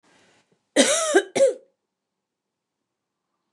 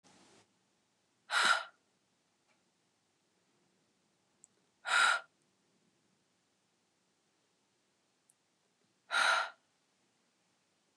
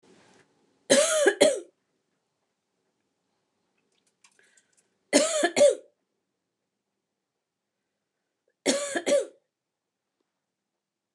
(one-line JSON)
{"cough_length": "3.5 s", "cough_amplitude": 26530, "cough_signal_mean_std_ratio": 0.33, "exhalation_length": "11.0 s", "exhalation_amplitude": 5090, "exhalation_signal_mean_std_ratio": 0.25, "three_cough_length": "11.1 s", "three_cough_amplitude": 18890, "three_cough_signal_mean_std_ratio": 0.29, "survey_phase": "beta (2021-08-13 to 2022-03-07)", "age": "45-64", "gender": "Female", "wearing_mask": "No", "symptom_none": true, "smoker_status": "Never smoked", "respiratory_condition_asthma": false, "respiratory_condition_other": false, "recruitment_source": "REACT", "submission_delay": "1 day", "covid_test_result": "Negative", "covid_test_method": "RT-qPCR", "influenza_a_test_result": "Negative", "influenza_b_test_result": "Negative"}